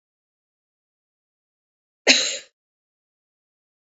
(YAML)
cough_length: 3.8 s
cough_amplitude: 31254
cough_signal_mean_std_ratio: 0.19
survey_phase: beta (2021-08-13 to 2022-03-07)
age: 18-44
gender: Female
wearing_mask: 'No'
symptom_cough_any: true
symptom_runny_or_blocked_nose: true
symptom_shortness_of_breath: true
symptom_sore_throat: true
symptom_headache: true
symptom_change_to_sense_of_smell_or_taste: true
symptom_loss_of_taste: true
symptom_other: true
smoker_status: Ex-smoker
respiratory_condition_asthma: false
respiratory_condition_other: false
recruitment_source: Test and Trace
submission_delay: 2 days
covid_test_result: Positive
covid_test_method: RT-qPCR
covid_ct_value: 25.1
covid_ct_gene: N gene